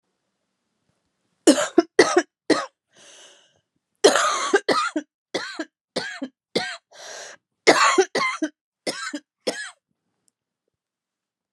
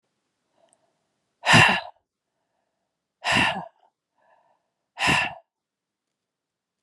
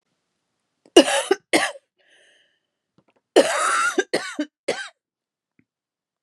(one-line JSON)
{"three_cough_length": "11.5 s", "three_cough_amplitude": 30174, "three_cough_signal_mean_std_ratio": 0.35, "exhalation_length": "6.8 s", "exhalation_amplitude": 27109, "exhalation_signal_mean_std_ratio": 0.29, "cough_length": "6.2 s", "cough_amplitude": 32767, "cough_signal_mean_std_ratio": 0.33, "survey_phase": "beta (2021-08-13 to 2022-03-07)", "age": "45-64", "gender": "Female", "wearing_mask": "No", "symptom_new_continuous_cough": true, "symptom_runny_or_blocked_nose": true, "symptom_sore_throat": true, "symptom_fatigue": true, "symptom_headache": true, "symptom_onset": "3 days", "smoker_status": "Never smoked", "respiratory_condition_asthma": false, "respiratory_condition_other": false, "recruitment_source": "Test and Trace", "submission_delay": "1 day", "covid_test_result": "Positive", "covid_test_method": "RT-qPCR", "covid_ct_value": 36.2, "covid_ct_gene": "N gene"}